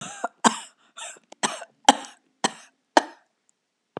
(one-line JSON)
{"cough_length": "4.0 s", "cough_amplitude": 32768, "cough_signal_mean_std_ratio": 0.22, "survey_phase": "beta (2021-08-13 to 2022-03-07)", "age": "65+", "gender": "Female", "wearing_mask": "No", "symptom_none": true, "symptom_onset": "12 days", "smoker_status": "Never smoked", "respiratory_condition_asthma": false, "respiratory_condition_other": false, "recruitment_source": "REACT", "submission_delay": "2 days", "covid_test_result": "Negative", "covid_test_method": "RT-qPCR", "influenza_a_test_result": "Negative", "influenza_b_test_result": "Negative"}